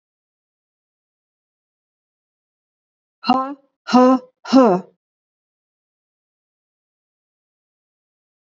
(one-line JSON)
{"exhalation_length": "8.4 s", "exhalation_amplitude": 26291, "exhalation_signal_mean_std_ratio": 0.24, "survey_phase": "beta (2021-08-13 to 2022-03-07)", "age": "65+", "gender": "Female", "wearing_mask": "No", "symptom_none": true, "smoker_status": "Ex-smoker", "respiratory_condition_asthma": false, "respiratory_condition_other": false, "recruitment_source": "REACT", "submission_delay": "1 day", "covid_test_result": "Negative", "covid_test_method": "RT-qPCR", "influenza_a_test_result": "Negative", "influenza_b_test_result": "Negative"}